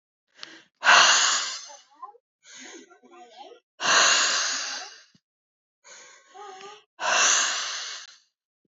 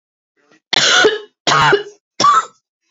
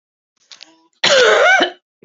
{"exhalation_length": "8.7 s", "exhalation_amplitude": 26539, "exhalation_signal_mean_std_ratio": 0.44, "three_cough_length": "2.9 s", "three_cough_amplitude": 32767, "three_cough_signal_mean_std_ratio": 0.52, "cough_length": "2.0 s", "cough_amplitude": 32767, "cough_signal_mean_std_ratio": 0.5, "survey_phase": "beta (2021-08-13 to 2022-03-07)", "age": "18-44", "gender": "Female", "wearing_mask": "No", "symptom_shortness_of_breath": true, "symptom_fatigue": true, "symptom_headache": true, "symptom_change_to_sense_of_smell_or_taste": true, "symptom_onset": "3 days", "smoker_status": "Ex-smoker", "respiratory_condition_asthma": true, "respiratory_condition_other": false, "recruitment_source": "Test and Trace", "submission_delay": "1 day", "covid_test_result": "Positive", "covid_test_method": "RT-qPCR", "covid_ct_value": 24.8, "covid_ct_gene": "ORF1ab gene", "covid_ct_mean": 24.9, "covid_viral_load": "6800 copies/ml", "covid_viral_load_category": "Minimal viral load (< 10K copies/ml)"}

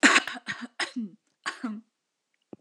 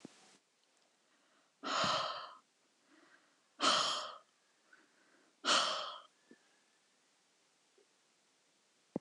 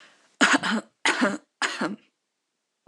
{"cough_length": "2.6 s", "cough_amplitude": 18569, "cough_signal_mean_std_ratio": 0.35, "exhalation_length": "9.0 s", "exhalation_amplitude": 4281, "exhalation_signal_mean_std_ratio": 0.34, "three_cough_length": "2.9 s", "three_cough_amplitude": 18566, "three_cough_signal_mean_std_ratio": 0.44, "survey_phase": "alpha (2021-03-01 to 2021-08-12)", "age": "18-44", "gender": "Female", "wearing_mask": "No", "symptom_none": true, "smoker_status": "Never smoked", "respiratory_condition_asthma": false, "respiratory_condition_other": false, "recruitment_source": "REACT", "submission_delay": "2 days", "covid_test_result": "Negative", "covid_test_method": "RT-qPCR"}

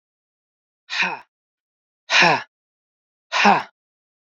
{"exhalation_length": "4.3 s", "exhalation_amplitude": 30248, "exhalation_signal_mean_std_ratio": 0.33, "survey_phase": "beta (2021-08-13 to 2022-03-07)", "age": "45-64", "gender": "Male", "wearing_mask": "No", "symptom_none": true, "smoker_status": "Never smoked", "respiratory_condition_asthma": false, "respiratory_condition_other": false, "recruitment_source": "REACT", "submission_delay": "1 day", "covid_test_result": "Negative", "covid_test_method": "RT-qPCR", "influenza_a_test_result": "Negative", "influenza_b_test_result": "Negative"}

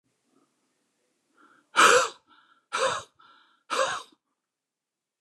{"exhalation_length": "5.2 s", "exhalation_amplitude": 21609, "exhalation_signal_mean_std_ratio": 0.29, "survey_phase": "beta (2021-08-13 to 2022-03-07)", "age": "45-64", "gender": "Male", "wearing_mask": "No", "symptom_none": true, "smoker_status": "Ex-smoker", "respiratory_condition_asthma": true, "respiratory_condition_other": false, "recruitment_source": "REACT", "submission_delay": "5 days", "covid_test_result": "Negative", "covid_test_method": "RT-qPCR", "influenza_a_test_result": "Negative", "influenza_b_test_result": "Negative"}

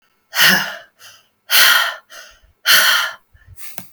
{"exhalation_length": "3.9 s", "exhalation_amplitude": 30479, "exhalation_signal_mean_std_ratio": 0.49, "survey_phase": "alpha (2021-03-01 to 2021-08-12)", "age": "18-44", "gender": "Female", "wearing_mask": "No", "symptom_none": true, "smoker_status": "Never smoked", "respiratory_condition_asthma": false, "respiratory_condition_other": false, "recruitment_source": "REACT", "submission_delay": "1 day", "covid_test_result": "Negative", "covid_test_method": "RT-qPCR"}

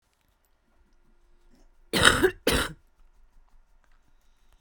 {"cough_length": "4.6 s", "cough_amplitude": 28982, "cough_signal_mean_std_ratio": 0.28, "survey_phase": "beta (2021-08-13 to 2022-03-07)", "age": "18-44", "gender": "Female", "wearing_mask": "No", "symptom_cough_any": true, "symptom_runny_or_blocked_nose": true, "symptom_sore_throat": true, "symptom_diarrhoea": true, "symptom_fatigue": true, "symptom_change_to_sense_of_smell_or_taste": true, "symptom_loss_of_taste": true, "smoker_status": "Current smoker (11 or more cigarettes per day)", "respiratory_condition_asthma": false, "respiratory_condition_other": false, "recruitment_source": "Test and Trace", "submission_delay": "1 day", "covid_test_result": "Positive", "covid_test_method": "RT-qPCR"}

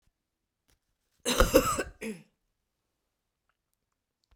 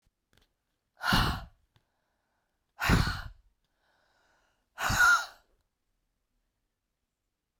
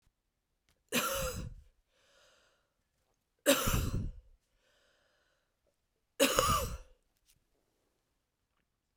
{"cough_length": "4.4 s", "cough_amplitude": 15871, "cough_signal_mean_std_ratio": 0.26, "exhalation_length": "7.6 s", "exhalation_amplitude": 8658, "exhalation_signal_mean_std_ratio": 0.31, "three_cough_length": "9.0 s", "three_cough_amplitude": 11168, "three_cough_signal_mean_std_ratio": 0.34, "survey_phase": "beta (2021-08-13 to 2022-03-07)", "age": "45-64", "gender": "Female", "wearing_mask": "No", "symptom_cough_any": true, "symptom_runny_or_blocked_nose": true, "symptom_headache": true, "symptom_change_to_sense_of_smell_or_taste": true, "symptom_loss_of_taste": true, "symptom_onset": "3 days", "smoker_status": "Ex-smoker", "respiratory_condition_asthma": false, "respiratory_condition_other": false, "recruitment_source": "Test and Trace", "submission_delay": "1 day", "covid_test_result": "Positive", "covid_test_method": "ePCR"}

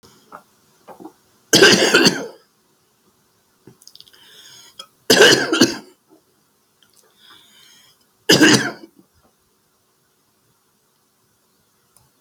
{"three_cough_length": "12.2 s", "three_cough_amplitude": 32768, "three_cough_signal_mean_std_ratio": 0.29, "survey_phase": "beta (2021-08-13 to 2022-03-07)", "age": "65+", "gender": "Male", "wearing_mask": "No", "symptom_none": true, "smoker_status": "Ex-smoker", "respiratory_condition_asthma": true, "respiratory_condition_other": true, "recruitment_source": "REACT", "submission_delay": "1 day", "covid_test_result": "Negative", "covid_test_method": "RT-qPCR", "influenza_a_test_result": "Negative", "influenza_b_test_result": "Negative"}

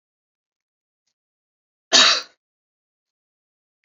{"cough_length": "3.8 s", "cough_amplitude": 31127, "cough_signal_mean_std_ratio": 0.2, "survey_phase": "beta (2021-08-13 to 2022-03-07)", "age": "65+", "gender": "Female", "wearing_mask": "No", "symptom_shortness_of_breath": true, "smoker_status": "Never smoked", "respiratory_condition_asthma": false, "respiratory_condition_other": false, "recruitment_source": "REACT", "submission_delay": "1 day", "covid_test_result": "Negative", "covid_test_method": "RT-qPCR"}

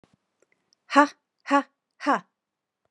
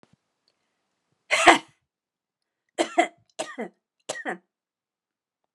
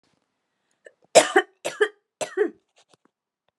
{"exhalation_length": "2.9 s", "exhalation_amplitude": 29050, "exhalation_signal_mean_std_ratio": 0.26, "cough_length": "5.5 s", "cough_amplitude": 32767, "cough_signal_mean_std_ratio": 0.23, "three_cough_length": "3.6 s", "three_cough_amplitude": 30261, "three_cough_signal_mean_std_ratio": 0.25, "survey_phase": "alpha (2021-03-01 to 2021-08-12)", "age": "18-44", "gender": "Female", "wearing_mask": "No", "symptom_none": true, "smoker_status": "Never smoked", "respiratory_condition_asthma": false, "respiratory_condition_other": false, "recruitment_source": "REACT", "submission_delay": "1 day", "covid_test_result": "Negative", "covid_test_method": "RT-qPCR"}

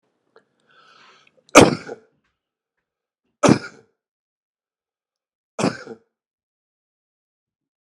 {"three_cough_length": "7.9 s", "three_cough_amplitude": 32768, "three_cough_signal_mean_std_ratio": 0.17, "survey_phase": "alpha (2021-03-01 to 2021-08-12)", "age": "45-64", "gender": "Male", "wearing_mask": "No", "symptom_none": true, "smoker_status": "Ex-smoker", "respiratory_condition_asthma": false, "respiratory_condition_other": false, "recruitment_source": "REACT", "submission_delay": "4 days", "covid_test_result": "Negative", "covid_test_method": "RT-qPCR"}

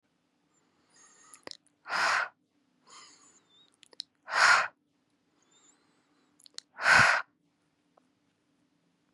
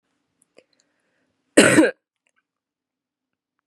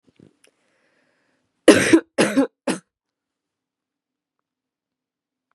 {"exhalation_length": "9.1 s", "exhalation_amplitude": 12987, "exhalation_signal_mean_std_ratio": 0.27, "cough_length": "3.7 s", "cough_amplitude": 32768, "cough_signal_mean_std_ratio": 0.23, "three_cough_length": "5.5 s", "three_cough_amplitude": 32768, "three_cough_signal_mean_std_ratio": 0.24, "survey_phase": "beta (2021-08-13 to 2022-03-07)", "age": "18-44", "gender": "Female", "wearing_mask": "No", "symptom_cough_any": true, "symptom_runny_or_blocked_nose": true, "symptom_sore_throat": true, "symptom_diarrhoea": true, "symptom_fatigue": true, "smoker_status": "Current smoker (e-cigarettes or vapes only)", "respiratory_condition_asthma": false, "respiratory_condition_other": false, "recruitment_source": "REACT", "submission_delay": "0 days", "covid_test_result": "Negative", "covid_test_method": "RT-qPCR", "influenza_a_test_result": "Negative", "influenza_b_test_result": "Negative"}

